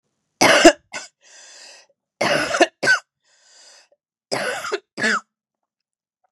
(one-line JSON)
{"three_cough_length": "6.3 s", "three_cough_amplitude": 32768, "three_cough_signal_mean_std_ratio": 0.35, "survey_phase": "beta (2021-08-13 to 2022-03-07)", "age": "45-64", "gender": "Female", "wearing_mask": "No", "symptom_cough_any": true, "symptom_sore_throat": true, "symptom_headache": true, "symptom_other": true, "symptom_onset": "8 days", "smoker_status": "Never smoked", "respiratory_condition_asthma": false, "respiratory_condition_other": false, "recruitment_source": "Test and Trace", "submission_delay": "2 days", "covid_test_result": "Positive", "covid_test_method": "RT-qPCR", "covid_ct_value": 32.7, "covid_ct_gene": "N gene"}